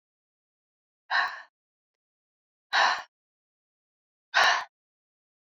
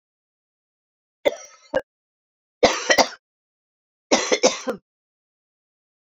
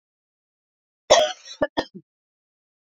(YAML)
exhalation_length: 5.5 s
exhalation_amplitude: 10794
exhalation_signal_mean_std_ratio: 0.29
three_cough_length: 6.1 s
three_cough_amplitude: 32717
three_cough_signal_mean_std_ratio: 0.28
cough_length: 3.0 s
cough_amplitude: 28288
cough_signal_mean_std_ratio: 0.24
survey_phase: beta (2021-08-13 to 2022-03-07)
age: 45-64
gender: Female
wearing_mask: 'No'
symptom_new_continuous_cough: true
symptom_runny_or_blocked_nose: true
symptom_fatigue: true
symptom_onset: 3 days
smoker_status: Ex-smoker
respiratory_condition_asthma: false
respiratory_condition_other: false
recruitment_source: Test and Trace
submission_delay: 2 days
covid_test_result: Positive
covid_test_method: LAMP